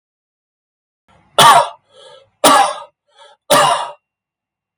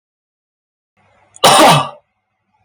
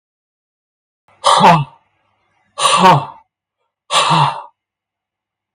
{
  "three_cough_length": "4.8 s",
  "three_cough_amplitude": 32768,
  "three_cough_signal_mean_std_ratio": 0.38,
  "cough_length": "2.6 s",
  "cough_amplitude": 32768,
  "cough_signal_mean_std_ratio": 0.36,
  "exhalation_length": "5.5 s",
  "exhalation_amplitude": 32768,
  "exhalation_signal_mean_std_ratio": 0.4,
  "survey_phase": "beta (2021-08-13 to 2022-03-07)",
  "age": "65+",
  "gender": "Male",
  "wearing_mask": "No",
  "symptom_none": true,
  "smoker_status": "Never smoked",
  "respiratory_condition_asthma": false,
  "respiratory_condition_other": false,
  "recruitment_source": "REACT",
  "submission_delay": "1 day",
  "covid_test_result": "Negative",
  "covid_test_method": "RT-qPCR",
  "influenza_a_test_result": "Negative",
  "influenza_b_test_result": "Negative"
}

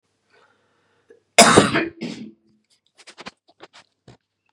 {
  "cough_length": "4.5 s",
  "cough_amplitude": 32768,
  "cough_signal_mean_std_ratio": 0.25,
  "survey_phase": "beta (2021-08-13 to 2022-03-07)",
  "age": "45-64",
  "gender": "Female",
  "wearing_mask": "No",
  "symptom_cough_any": true,
  "symptom_runny_or_blocked_nose": true,
  "symptom_shortness_of_breath": true,
  "symptom_fatigue": true,
  "symptom_headache": true,
  "symptom_change_to_sense_of_smell_or_taste": true,
  "symptom_loss_of_taste": true,
  "smoker_status": "Never smoked",
  "respiratory_condition_asthma": false,
  "respiratory_condition_other": false,
  "recruitment_source": "Test and Trace",
  "submission_delay": "2 days",
  "covid_test_result": "Positive",
  "covid_test_method": "LFT"
}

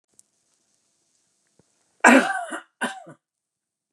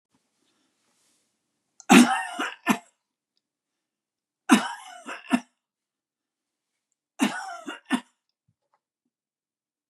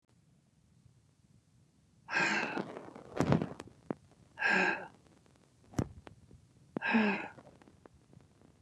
{
  "cough_length": "3.9 s",
  "cough_amplitude": 31766,
  "cough_signal_mean_std_ratio": 0.25,
  "three_cough_length": "9.9 s",
  "three_cough_amplitude": 27470,
  "three_cough_signal_mean_std_ratio": 0.23,
  "exhalation_length": "8.6 s",
  "exhalation_amplitude": 8189,
  "exhalation_signal_mean_std_ratio": 0.4,
  "survey_phase": "beta (2021-08-13 to 2022-03-07)",
  "age": "65+",
  "gender": "Male",
  "wearing_mask": "No",
  "symptom_none": true,
  "smoker_status": "Never smoked",
  "respiratory_condition_asthma": false,
  "respiratory_condition_other": false,
  "recruitment_source": "REACT",
  "submission_delay": "1 day",
  "covid_test_result": "Negative",
  "covid_test_method": "RT-qPCR"
}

